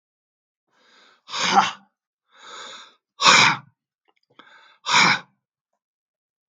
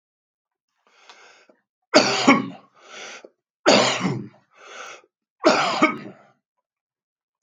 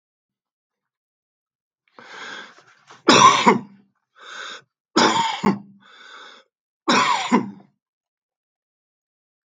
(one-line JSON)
{"exhalation_length": "6.5 s", "exhalation_amplitude": 32768, "exhalation_signal_mean_std_ratio": 0.31, "three_cough_length": "7.4 s", "three_cough_amplitude": 32768, "three_cough_signal_mean_std_ratio": 0.36, "cough_length": "9.6 s", "cough_amplitude": 32768, "cough_signal_mean_std_ratio": 0.33, "survey_phase": "beta (2021-08-13 to 2022-03-07)", "age": "65+", "gender": "Male", "wearing_mask": "No", "symptom_cough_any": true, "symptom_sore_throat": true, "symptom_onset": "8 days", "smoker_status": "Never smoked", "respiratory_condition_asthma": false, "respiratory_condition_other": false, "recruitment_source": "Test and Trace", "submission_delay": "1 day", "covid_test_result": "Positive", "covid_test_method": "RT-qPCR", "covid_ct_value": 19.7, "covid_ct_gene": "ORF1ab gene"}